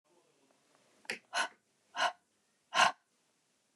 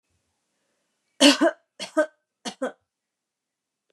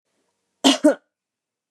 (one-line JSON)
{"exhalation_length": "3.8 s", "exhalation_amplitude": 7557, "exhalation_signal_mean_std_ratio": 0.27, "three_cough_length": "3.9 s", "three_cough_amplitude": 25640, "three_cough_signal_mean_std_ratio": 0.26, "cough_length": "1.7 s", "cough_amplitude": 27544, "cough_signal_mean_std_ratio": 0.28, "survey_phase": "beta (2021-08-13 to 2022-03-07)", "age": "45-64", "gender": "Female", "wearing_mask": "No", "symptom_runny_or_blocked_nose": true, "symptom_headache": true, "symptom_loss_of_taste": true, "smoker_status": "Ex-smoker", "respiratory_condition_asthma": false, "respiratory_condition_other": false, "recruitment_source": "Test and Trace", "submission_delay": "2 days", "covid_test_result": "Positive", "covid_test_method": "RT-qPCR", "covid_ct_value": 22.6, "covid_ct_gene": "N gene", "covid_ct_mean": 22.8, "covid_viral_load": "33000 copies/ml", "covid_viral_load_category": "Low viral load (10K-1M copies/ml)"}